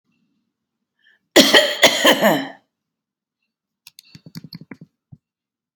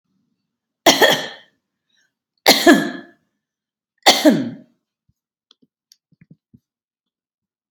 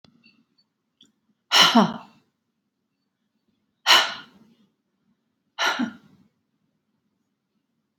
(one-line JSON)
{"cough_length": "5.8 s", "cough_amplitude": 32768, "cough_signal_mean_std_ratio": 0.31, "three_cough_length": "7.7 s", "three_cough_amplitude": 32768, "three_cough_signal_mean_std_ratio": 0.28, "exhalation_length": "8.0 s", "exhalation_amplitude": 28538, "exhalation_signal_mean_std_ratio": 0.25, "survey_phase": "beta (2021-08-13 to 2022-03-07)", "age": "65+", "gender": "Female", "wearing_mask": "No", "symptom_none": true, "smoker_status": "Never smoked", "respiratory_condition_asthma": false, "respiratory_condition_other": false, "recruitment_source": "REACT", "submission_delay": "1 day", "covid_test_result": "Negative", "covid_test_method": "RT-qPCR", "influenza_a_test_result": "Negative", "influenza_b_test_result": "Negative"}